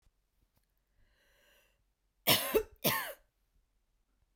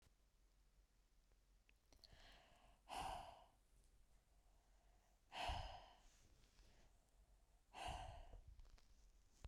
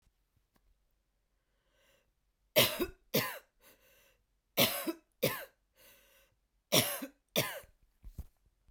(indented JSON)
{
  "cough_length": "4.4 s",
  "cough_amplitude": 7507,
  "cough_signal_mean_std_ratio": 0.27,
  "exhalation_length": "9.5 s",
  "exhalation_amplitude": 506,
  "exhalation_signal_mean_std_ratio": 0.48,
  "three_cough_length": "8.7 s",
  "three_cough_amplitude": 10710,
  "three_cough_signal_mean_std_ratio": 0.3,
  "survey_phase": "beta (2021-08-13 to 2022-03-07)",
  "age": "18-44",
  "gender": "Female",
  "wearing_mask": "No",
  "symptom_runny_or_blocked_nose": true,
  "symptom_change_to_sense_of_smell_or_taste": true,
  "symptom_loss_of_taste": true,
  "smoker_status": "Never smoked",
  "respiratory_condition_asthma": false,
  "respiratory_condition_other": false,
  "recruitment_source": "Test and Trace",
  "submission_delay": "2 days",
  "covid_test_result": "Positive",
  "covid_test_method": "RT-qPCR",
  "covid_ct_value": 21.6,
  "covid_ct_gene": "ORF1ab gene"
}